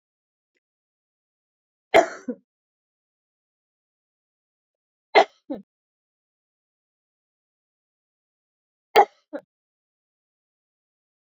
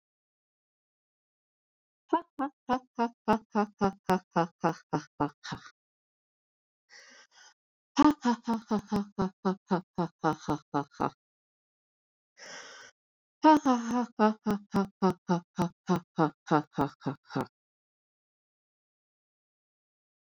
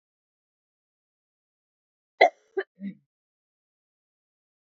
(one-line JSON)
{"three_cough_length": "11.3 s", "three_cough_amplitude": 26270, "three_cough_signal_mean_std_ratio": 0.14, "exhalation_length": "20.4 s", "exhalation_amplitude": 11933, "exhalation_signal_mean_std_ratio": 0.33, "cough_length": "4.7 s", "cough_amplitude": 23590, "cough_signal_mean_std_ratio": 0.13, "survey_phase": "beta (2021-08-13 to 2022-03-07)", "age": "45-64", "gender": "Female", "wearing_mask": "No", "symptom_cough_any": true, "symptom_runny_or_blocked_nose": true, "symptom_fatigue": true, "symptom_change_to_sense_of_smell_or_taste": true, "symptom_loss_of_taste": true, "symptom_onset": "4 days", "smoker_status": "Ex-smoker", "respiratory_condition_asthma": false, "respiratory_condition_other": false, "recruitment_source": "Test and Trace", "submission_delay": "2 days", "covid_test_result": "Positive", "covid_test_method": "RT-qPCR"}